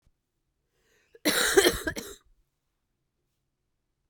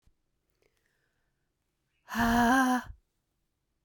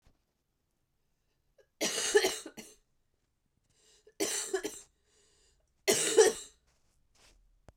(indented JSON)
{
  "cough_length": "4.1 s",
  "cough_amplitude": 21268,
  "cough_signal_mean_std_ratio": 0.29,
  "exhalation_length": "3.8 s",
  "exhalation_amplitude": 7674,
  "exhalation_signal_mean_std_ratio": 0.37,
  "three_cough_length": "7.8 s",
  "three_cough_amplitude": 9593,
  "three_cough_signal_mean_std_ratio": 0.31,
  "survey_phase": "beta (2021-08-13 to 2022-03-07)",
  "age": "45-64",
  "gender": "Female",
  "wearing_mask": "No",
  "symptom_cough_any": true,
  "symptom_runny_or_blocked_nose": true,
  "symptom_sore_throat": true,
  "symptom_headache": true,
  "symptom_other": true,
  "smoker_status": "Never smoked",
  "respiratory_condition_asthma": false,
  "respiratory_condition_other": false,
  "recruitment_source": "Test and Trace",
  "submission_delay": "1 day",
  "covid_test_result": "Positive",
  "covid_test_method": "RT-qPCR",
  "covid_ct_value": 35.2,
  "covid_ct_gene": "N gene"
}